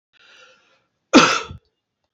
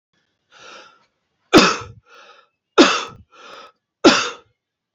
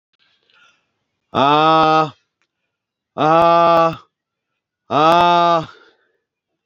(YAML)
cough_length: 2.1 s
cough_amplitude: 29343
cough_signal_mean_std_ratio: 0.27
three_cough_length: 4.9 s
three_cough_amplitude: 30211
three_cough_signal_mean_std_ratio: 0.3
exhalation_length: 6.7 s
exhalation_amplitude: 29933
exhalation_signal_mean_std_ratio: 0.45
survey_phase: beta (2021-08-13 to 2022-03-07)
age: 65+
gender: Male
wearing_mask: 'No'
symptom_none: true
smoker_status: Ex-smoker
respiratory_condition_asthma: false
respiratory_condition_other: false
recruitment_source: REACT
submission_delay: 3 days
covid_test_result: Negative
covid_test_method: RT-qPCR